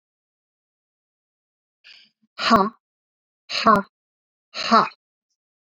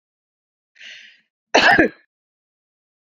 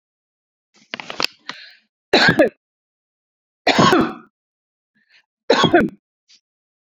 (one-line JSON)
{"exhalation_length": "5.7 s", "exhalation_amplitude": 28467, "exhalation_signal_mean_std_ratio": 0.27, "cough_length": "3.2 s", "cough_amplitude": 31400, "cough_signal_mean_std_ratio": 0.27, "three_cough_length": "7.0 s", "three_cough_amplitude": 32768, "three_cough_signal_mean_std_ratio": 0.33, "survey_phase": "beta (2021-08-13 to 2022-03-07)", "age": "45-64", "gender": "Female", "wearing_mask": "No", "symptom_runny_or_blocked_nose": true, "symptom_headache": true, "symptom_onset": "10 days", "smoker_status": "Ex-smoker", "respiratory_condition_asthma": false, "respiratory_condition_other": false, "recruitment_source": "REACT", "submission_delay": "2 days", "covid_test_result": "Negative", "covid_test_method": "RT-qPCR"}